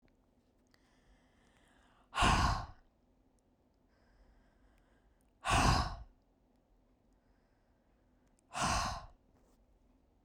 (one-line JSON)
{"exhalation_length": "10.2 s", "exhalation_amplitude": 5657, "exhalation_signal_mean_std_ratio": 0.31, "survey_phase": "beta (2021-08-13 to 2022-03-07)", "age": "45-64", "gender": "Female", "wearing_mask": "No", "symptom_none": true, "smoker_status": "Never smoked", "respiratory_condition_asthma": false, "respiratory_condition_other": false, "recruitment_source": "REACT", "submission_delay": "0 days", "covid_test_result": "Negative", "covid_test_method": "RT-qPCR"}